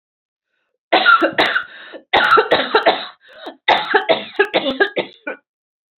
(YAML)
cough_length: 6.0 s
cough_amplitude: 30942
cough_signal_mean_std_ratio: 0.51
survey_phase: alpha (2021-03-01 to 2021-08-12)
age: 18-44
gender: Female
wearing_mask: 'No'
symptom_none: true
smoker_status: Never smoked
respiratory_condition_asthma: false
respiratory_condition_other: false
recruitment_source: REACT
submission_delay: 2 days
covid_test_result: Negative
covid_test_method: RT-qPCR